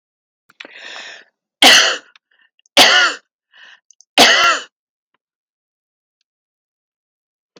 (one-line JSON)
{"three_cough_length": "7.6 s", "three_cough_amplitude": 32768, "three_cough_signal_mean_std_ratio": 0.32, "survey_phase": "beta (2021-08-13 to 2022-03-07)", "age": "45-64", "gender": "Female", "wearing_mask": "No", "symptom_none": true, "smoker_status": "Never smoked", "respiratory_condition_asthma": false, "respiratory_condition_other": false, "recruitment_source": "REACT", "submission_delay": "2 days", "covid_test_result": "Negative", "covid_test_method": "RT-qPCR"}